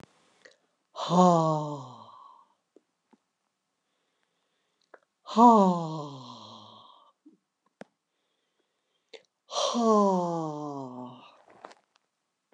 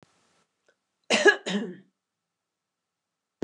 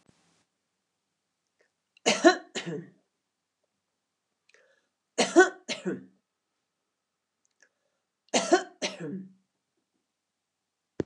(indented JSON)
{
  "exhalation_length": "12.5 s",
  "exhalation_amplitude": 16121,
  "exhalation_signal_mean_std_ratio": 0.33,
  "cough_length": "3.4 s",
  "cough_amplitude": 15920,
  "cough_signal_mean_std_ratio": 0.25,
  "three_cough_length": "11.1 s",
  "three_cough_amplitude": 17653,
  "three_cough_signal_mean_std_ratio": 0.23,
  "survey_phase": "alpha (2021-03-01 to 2021-08-12)",
  "age": "45-64",
  "gender": "Female",
  "wearing_mask": "No",
  "symptom_none": true,
  "smoker_status": "Never smoked",
  "respiratory_condition_asthma": false,
  "respiratory_condition_other": false,
  "recruitment_source": "REACT",
  "submission_delay": "2 days",
  "covid_test_result": "Negative",
  "covid_test_method": "RT-qPCR"
}